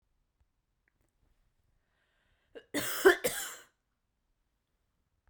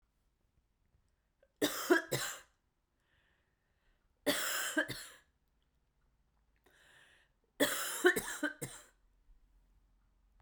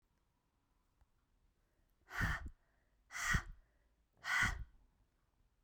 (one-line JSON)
{"cough_length": "5.3 s", "cough_amplitude": 10862, "cough_signal_mean_std_ratio": 0.21, "three_cough_length": "10.4 s", "three_cough_amplitude": 6708, "three_cough_signal_mean_std_ratio": 0.33, "exhalation_length": "5.6 s", "exhalation_amplitude": 2753, "exhalation_signal_mean_std_ratio": 0.35, "survey_phase": "beta (2021-08-13 to 2022-03-07)", "age": "45-64", "gender": "Female", "wearing_mask": "No", "symptom_cough_any": true, "symptom_fatigue": true, "symptom_fever_high_temperature": true, "symptom_headache": true, "symptom_change_to_sense_of_smell_or_taste": true, "symptom_loss_of_taste": true, "symptom_other": true, "symptom_onset": "5 days", "smoker_status": "Never smoked", "respiratory_condition_asthma": false, "respiratory_condition_other": false, "recruitment_source": "Test and Trace", "submission_delay": "2 days", "covid_test_result": "Positive", "covid_test_method": "RT-qPCR", "covid_ct_value": 15.1, "covid_ct_gene": "ORF1ab gene", "covid_ct_mean": 16.4, "covid_viral_load": "4200000 copies/ml", "covid_viral_load_category": "High viral load (>1M copies/ml)"}